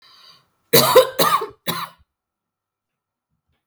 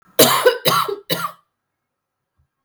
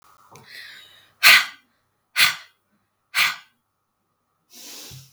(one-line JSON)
{"three_cough_length": "3.7 s", "three_cough_amplitude": 32768, "three_cough_signal_mean_std_ratio": 0.33, "cough_length": "2.6 s", "cough_amplitude": 32768, "cough_signal_mean_std_ratio": 0.42, "exhalation_length": "5.1 s", "exhalation_amplitude": 32768, "exhalation_signal_mean_std_ratio": 0.27, "survey_phase": "beta (2021-08-13 to 2022-03-07)", "age": "18-44", "gender": "Female", "wearing_mask": "No", "symptom_cough_any": true, "symptom_shortness_of_breath": true, "symptom_sore_throat": true, "symptom_abdominal_pain": true, "symptom_fatigue": true, "symptom_headache": true, "smoker_status": "Never smoked", "respiratory_condition_asthma": true, "respiratory_condition_other": false, "recruitment_source": "Test and Trace", "submission_delay": "1 day", "covid_test_result": "Positive", "covid_test_method": "RT-qPCR"}